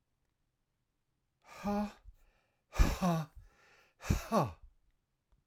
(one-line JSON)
{"exhalation_length": "5.5 s", "exhalation_amplitude": 7019, "exhalation_signal_mean_std_ratio": 0.35, "survey_phase": "alpha (2021-03-01 to 2021-08-12)", "age": "45-64", "gender": "Male", "wearing_mask": "No", "symptom_none": true, "smoker_status": "Never smoked", "respiratory_condition_asthma": false, "respiratory_condition_other": false, "recruitment_source": "REACT", "submission_delay": "1 day", "covid_test_result": "Negative", "covid_test_method": "RT-qPCR"}